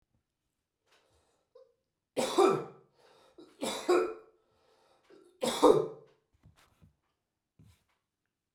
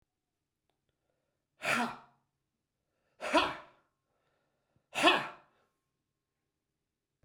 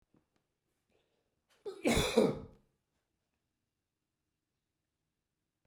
{"three_cough_length": "8.5 s", "three_cough_amplitude": 11706, "three_cough_signal_mean_std_ratio": 0.28, "exhalation_length": "7.2 s", "exhalation_amplitude": 9677, "exhalation_signal_mean_std_ratio": 0.26, "cough_length": "5.7 s", "cough_amplitude": 7552, "cough_signal_mean_std_ratio": 0.24, "survey_phase": "beta (2021-08-13 to 2022-03-07)", "age": "65+", "gender": "Male", "wearing_mask": "No", "symptom_runny_or_blocked_nose": true, "smoker_status": "Ex-smoker", "respiratory_condition_asthma": false, "respiratory_condition_other": false, "recruitment_source": "REACT", "submission_delay": "1 day", "covid_test_result": "Negative", "covid_test_method": "RT-qPCR", "influenza_a_test_result": "Negative", "influenza_b_test_result": "Negative"}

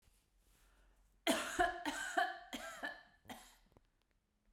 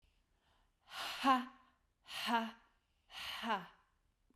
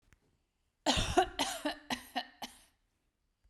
{"three_cough_length": "4.5 s", "three_cough_amplitude": 2876, "three_cough_signal_mean_std_ratio": 0.42, "exhalation_length": "4.4 s", "exhalation_amplitude": 3270, "exhalation_signal_mean_std_ratio": 0.39, "cough_length": "3.5 s", "cough_amplitude": 6721, "cough_signal_mean_std_ratio": 0.38, "survey_phase": "beta (2021-08-13 to 2022-03-07)", "age": "18-44", "gender": "Female", "wearing_mask": "No", "symptom_none": true, "smoker_status": "Never smoked", "respiratory_condition_asthma": false, "respiratory_condition_other": false, "recruitment_source": "REACT", "submission_delay": "1 day", "covid_test_result": "Negative", "covid_test_method": "RT-qPCR", "influenza_a_test_result": "Negative", "influenza_b_test_result": "Negative"}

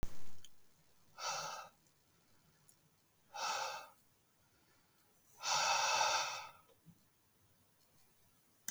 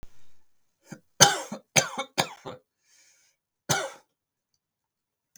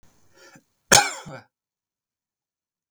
{"exhalation_length": "8.7 s", "exhalation_amplitude": 3096, "exhalation_signal_mean_std_ratio": 0.46, "three_cough_length": "5.4 s", "three_cough_amplitude": 32766, "three_cough_signal_mean_std_ratio": 0.26, "cough_length": "2.9 s", "cough_amplitude": 32768, "cough_signal_mean_std_ratio": 0.19, "survey_phase": "beta (2021-08-13 to 2022-03-07)", "age": "18-44", "gender": "Male", "wearing_mask": "No", "symptom_none": true, "smoker_status": "Never smoked", "respiratory_condition_asthma": true, "respiratory_condition_other": false, "recruitment_source": "REACT", "submission_delay": "1 day", "covid_test_result": "Negative", "covid_test_method": "RT-qPCR", "influenza_a_test_result": "Negative", "influenza_b_test_result": "Negative"}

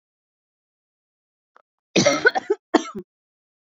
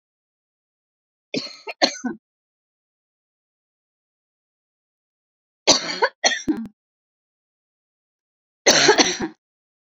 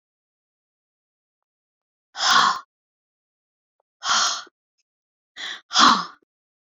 {"cough_length": "3.8 s", "cough_amplitude": 27794, "cough_signal_mean_std_ratio": 0.28, "three_cough_length": "10.0 s", "three_cough_amplitude": 32337, "three_cough_signal_mean_std_ratio": 0.27, "exhalation_length": "6.7 s", "exhalation_amplitude": 26111, "exhalation_signal_mean_std_ratio": 0.31, "survey_phase": "beta (2021-08-13 to 2022-03-07)", "age": "45-64", "gender": "Female", "wearing_mask": "No", "symptom_none": true, "smoker_status": "Never smoked", "respiratory_condition_asthma": false, "respiratory_condition_other": false, "recruitment_source": "REACT", "submission_delay": "0 days", "covid_test_result": "Negative", "covid_test_method": "RT-qPCR"}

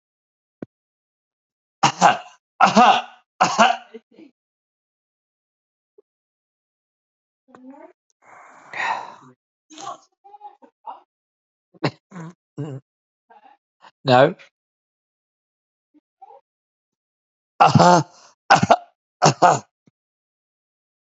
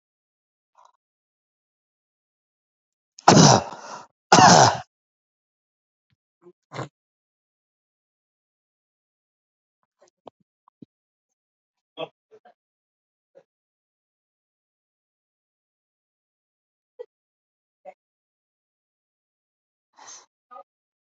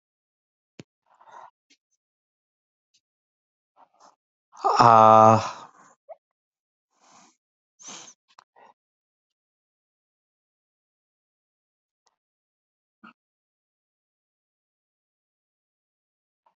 {"three_cough_length": "21.1 s", "three_cough_amplitude": 32767, "three_cough_signal_mean_std_ratio": 0.26, "cough_length": "21.1 s", "cough_amplitude": 31220, "cough_signal_mean_std_ratio": 0.16, "exhalation_length": "16.6 s", "exhalation_amplitude": 28049, "exhalation_signal_mean_std_ratio": 0.15, "survey_phase": "alpha (2021-03-01 to 2021-08-12)", "age": "45-64", "gender": "Male", "wearing_mask": "No", "symptom_none": true, "smoker_status": "Never smoked", "respiratory_condition_asthma": false, "respiratory_condition_other": true, "recruitment_source": "REACT", "submission_delay": "1 day", "covid_test_result": "Negative", "covid_test_method": "RT-qPCR"}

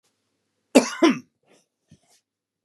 {"cough_length": "2.6 s", "cough_amplitude": 31734, "cough_signal_mean_std_ratio": 0.24, "survey_phase": "beta (2021-08-13 to 2022-03-07)", "age": "65+", "gender": "Male", "wearing_mask": "No", "symptom_none": true, "smoker_status": "Never smoked", "respiratory_condition_asthma": false, "respiratory_condition_other": false, "recruitment_source": "REACT", "submission_delay": "5 days", "covid_test_result": "Negative", "covid_test_method": "RT-qPCR", "influenza_a_test_result": "Negative", "influenza_b_test_result": "Negative"}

